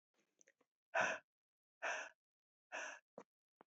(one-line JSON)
{"exhalation_length": "3.7 s", "exhalation_amplitude": 1776, "exhalation_signal_mean_std_ratio": 0.32, "survey_phase": "beta (2021-08-13 to 2022-03-07)", "age": "45-64", "gender": "Female", "wearing_mask": "No", "symptom_cough_any": true, "symptom_runny_or_blocked_nose": true, "symptom_sore_throat": true, "symptom_fatigue": true, "symptom_fever_high_temperature": true, "symptom_other": true, "symptom_onset": "4 days", "smoker_status": "Never smoked", "respiratory_condition_asthma": false, "respiratory_condition_other": false, "recruitment_source": "Test and Trace", "submission_delay": "2 days", "covid_test_result": "Positive", "covid_test_method": "RT-qPCR", "covid_ct_value": 16.9, "covid_ct_gene": "ORF1ab gene", "covid_ct_mean": 17.4, "covid_viral_load": "1900000 copies/ml", "covid_viral_load_category": "High viral load (>1M copies/ml)"}